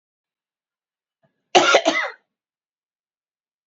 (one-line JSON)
{"cough_length": "3.7 s", "cough_amplitude": 32767, "cough_signal_mean_std_ratio": 0.27, "survey_phase": "beta (2021-08-13 to 2022-03-07)", "age": "45-64", "gender": "Female", "wearing_mask": "No", "symptom_cough_any": true, "symptom_diarrhoea": true, "symptom_change_to_sense_of_smell_or_taste": true, "symptom_other": true, "symptom_onset": "4 days", "smoker_status": "Never smoked", "respiratory_condition_asthma": false, "respiratory_condition_other": false, "recruitment_source": "Test and Trace", "submission_delay": "2 days", "covid_test_result": "Positive", "covid_test_method": "ePCR"}